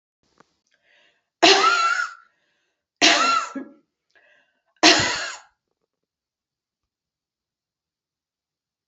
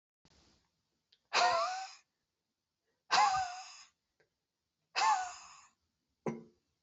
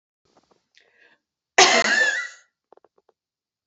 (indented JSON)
{
  "three_cough_length": "8.9 s",
  "three_cough_amplitude": 31588,
  "three_cough_signal_mean_std_ratio": 0.32,
  "exhalation_length": "6.8 s",
  "exhalation_amplitude": 5815,
  "exhalation_signal_mean_std_ratio": 0.37,
  "cough_length": "3.7 s",
  "cough_amplitude": 32139,
  "cough_signal_mean_std_ratio": 0.32,
  "survey_phase": "beta (2021-08-13 to 2022-03-07)",
  "age": "45-64",
  "gender": "Female",
  "wearing_mask": "No",
  "symptom_headache": true,
  "smoker_status": "Never smoked",
  "respiratory_condition_asthma": false,
  "respiratory_condition_other": false,
  "recruitment_source": "REACT",
  "submission_delay": "2 days",
  "covid_test_result": "Negative",
  "covid_test_method": "RT-qPCR"
}